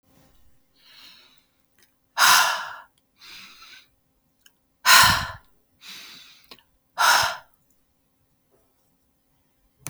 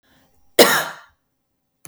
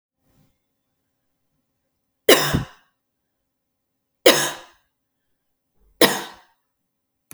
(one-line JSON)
{"exhalation_length": "9.9 s", "exhalation_amplitude": 31688, "exhalation_signal_mean_std_ratio": 0.28, "cough_length": "1.9 s", "cough_amplitude": 32768, "cough_signal_mean_std_ratio": 0.28, "three_cough_length": "7.3 s", "three_cough_amplitude": 32768, "three_cough_signal_mean_std_ratio": 0.22, "survey_phase": "beta (2021-08-13 to 2022-03-07)", "age": "18-44", "gender": "Female", "wearing_mask": "No", "symptom_none": true, "smoker_status": "Never smoked", "respiratory_condition_asthma": false, "respiratory_condition_other": false, "recruitment_source": "REACT", "submission_delay": "2 days", "covid_test_result": "Negative", "covid_test_method": "RT-qPCR", "influenza_a_test_result": "Negative", "influenza_b_test_result": "Negative"}